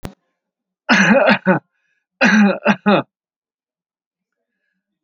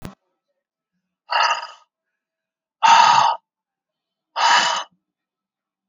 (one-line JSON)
{"cough_length": "5.0 s", "cough_amplitude": 32767, "cough_signal_mean_std_ratio": 0.42, "exhalation_length": "5.9 s", "exhalation_amplitude": 28284, "exhalation_signal_mean_std_ratio": 0.37, "survey_phase": "alpha (2021-03-01 to 2021-08-12)", "age": "65+", "gender": "Male", "wearing_mask": "No", "symptom_none": true, "smoker_status": "Never smoked", "respiratory_condition_asthma": false, "respiratory_condition_other": false, "recruitment_source": "REACT", "submission_delay": "2 days", "covid_test_result": "Negative", "covid_test_method": "RT-qPCR"}